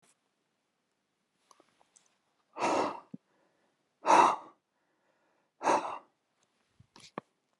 {"exhalation_length": "7.6 s", "exhalation_amplitude": 10733, "exhalation_signal_mean_std_ratio": 0.26, "survey_phase": "alpha (2021-03-01 to 2021-08-12)", "age": "65+", "gender": "Male", "wearing_mask": "No", "symptom_none": true, "smoker_status": "Never smoked", "respiratory_condition_asthma": false, "respiratory_condition_other": false, "recruitment_source": "REACT", "submission_delay": "1 day", "covid_test_result": "Negative", "covid_test_method": "RT-qPCR"}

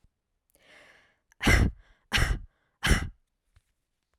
{"exhalation_length": "4.2 s", "exhalation_amplitude": 13671, "exhalation_signal_mean_std_ratio": 0.34, "survey_phase": "alpha (2021-03-01 to 2021-08-12)", "age": "18-44", "gender": "Female", "wearing_mask": "No", "symptom_none": true, "smoker_status": "Ex-smoker", "respiratory_condition_asthma": true, "respiratory_condition_other": false, "recruitment_source": "REACT", "submission_delay": "1 day", "covid_test_result": "Negative", "covid_test_method": "RT-qPCR"}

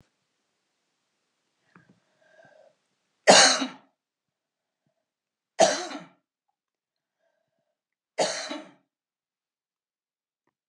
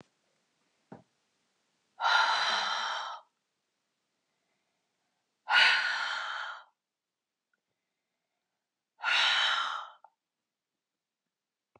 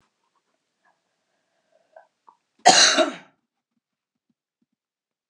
{"three_cough_length": "10.7 s", "three_cough_amplitude": 26342, "three_cough_signal_mean_std_ratio": 0.2, "exhalation_length": "11.8 s", "exhalation_amplitude": 11376, "exhalation_signal_mean_std_ratio": 0.38, "cough_length": "5.3 s", "cough_amplitude": 30681, "cough_signal_mean_std_ratio": 0.22, "survey_phase": "beta (2021-08-13 to 2022-03-07)", "age": "45-64", "gender": "Female", "wearing_mask": "No", "symptom_none": true, "smoker_status": "Never smoked", "respiratory_condition_asthma": false, "respiratory_condition_other": false, "recruitment_source": "REACT", "submission_delay": "2 days", "covid_test_result": "Negative", "covid_test_method": "RT-qPCR"}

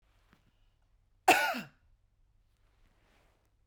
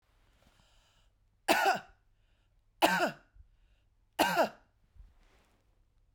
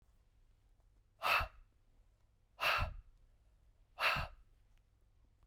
{"cough_length": "3.7 s", "cough_amplitude": 10519, "cough_signal_mean_std_ratio": 0.22, "three_cough_length": "6.1 s", "three_cough_amplitude": 9275, "three_cough_signal_mean_std_ratio": 0.31, "exhalation_length": "5.5 s", "exhalation_amplitude": 3375, "exhalation_signal_mean_std_ratio": 0.35, "survey_phase": "beta (2021-08-13 to 2022-03-07)", "age": "45-64", "gender": "Female", "wearing_mask": "No", "symptom_none": true, "symptom_onset": "12 days", "smoker_status": "Current smoker (1 to 10 cigarettes per day)", "respiratory_condition_asthma": false, "respiratory_condition_other": false, "recruitment_source": "REACT", "submission_delay": "1 day", "covid_test_result": "Negative", "covid_test_method": "RT-qPCR"}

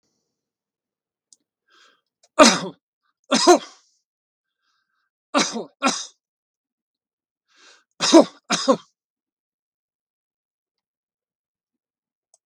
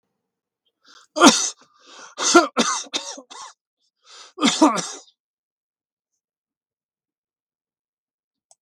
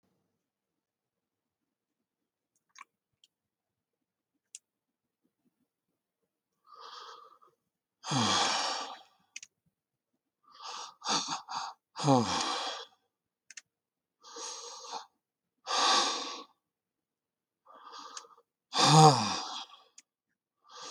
{"three_cough_length": "12.5 s", "three_cough_amplitude": 32768, "three_cough_signal_mean_std_ratio": 0.22, "cough_length": "8.6 s", "cough_amplitude": 32768, "cough_signal_mean_std_ratio": 0.28, "exhalation_length": "20.9 s", "exhalation_amplitude": 19007, "exhalation_signal_mean_std_ratio": 0.3, "survey_phase": "beta (2021-08-13 to 2022-03-07)", "age": "65+", "gender": "Male", "wearing_mask": "No", "symptom_none": true, "smoker_status": "Ex-smoker", "respiratory_condition_asthma": false, "respiratory_condition_other": false, "recruitment_source": "REACT", "submission_delay": "2 days", "covid_test_result": "Negative", "covid_test_method": "RT-qPCR", "influenza_a_test_result": "Unknown/Void", "influenza_b_test_result": "Unknown/Void"}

